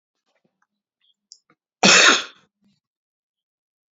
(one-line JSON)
{"cough_length": "3.9 s", "cough_amplitude": 32768, "cough_signal_mean_std_ratio": 0.25, "survey_phase": "beta (2021-08-13 to 2022-03-07)", "age": "65+", "gender": "Male", "wearing_mask": "No", "symptom_none": true, "smoker_status": "Ex-smoker", "respiratory_condition_asthma": false, "respiratory_condition_other": false, "recruitment_source": "REACT", "submission_delay": "2 days", "covid_test_result": "Negative", "covid_test_method": "RT-qPCR"}